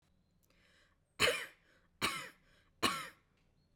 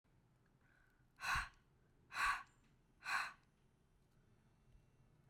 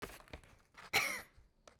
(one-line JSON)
{"three_cough_length": "3.8 s", "three_cough_amplitude": 4618, "three_cough_signal_mean_std_ratio": 0.32, "exhalation_length": "5.3 s", "exhalation_amplitude": 1454, "exhalation_signal_mean_std_ratio": 0.34, "cough_length": "1.8 s", "cough_amplitude": 3828, "cough_signal_mean_std_ratio": 0.38, "survey_phase": "beta (2021-08-13 to 2022-03-07)", "age": "18-44", "gender": "Female", "wearing_mask": "No", "symptom_none": true, "smoker_status": "Never smoked", "respiratory_condition_asthma": false, "respiratory_condition_other": false, "recruitment_source": "REACT", "submission_delay": "3 days", "covid_test_result": "Negative", "covid_test_method": "RT-qPCR"}